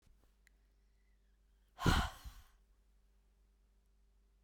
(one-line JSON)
{"exhalation_length": "4.4 s", "exhalation_amplitude": 4303, "exhalation_signal_mean_std_ratio": 0.24, "survey_phase": "beta (2021-08-13 to 2022-03-07)", "age": "18-44", "gender": "Female", "wearing_mask": "No", "symptom_cough_any": true, "symptom_new_continuous_cough": true, "symptom_sore_throat": true, "symptom_diarrhoea": true, "symptom_fatigue": true, "symptom_fever_high_temperature": true, "symptom_headache": true, "symptom_onset": "2 days", "smoker_status": "Current smoker (1 to 10 cigarettes per day)", "respiratory_condition_asthma": false, "respiratory_condition_other": false, "recruitment_source": "Test and Trace", "submission_delay": "1 day", "covid_test_result": "Negative", "covid_test_method": "RT-qPCR"}